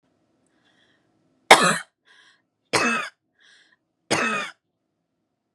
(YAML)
three_cough_length: 5.5 s
three_cough_amplitude: 32768
three_cough_signal_mean_std_ratio: 0.27
survey_phase: beta (2021-08-13 to 2022-03-07)
age: 18-44
gender: Female
wearing_mask: 'No'
symptom_none: true
smoker_status: Never smoked
respiratory_condition_asthma: false
respiratory_condition_other: false
recruitment_source: REACT
submission_delay: 1 day
covid_test_result: Negative
covid_test_method: RT-qPCR
influenza_a_test_result: Negative
influenza_b_test_result: Negative